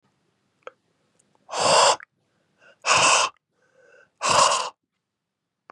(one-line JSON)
{"exhalation_length": "5.7 s", "exhalation_amplitude": 18840, "exhalation_signal_mean_std_ratio": 0.39, "survey_phase": "beta (2021-08-13 to 2022-03-07)", "age": "45-64", "gender": "Male", "wearing_mask": "No", "symptom_cough_any": true, "symptom_runny_or_blocked_nose": true, "symptom_sore_throat": true, "smoker_status": "Ex-smoker", "respiratory_condition_asthma": false, "respiratory_condition_other": false, "recruitment_source": "Test and Trace", "submission_delay": "1 day", "covid_test_result": "Positive", "covid_test_method": "RT-qPCR", "covid_ct_value": 18.6, "covid_ct_gene": "N gene"}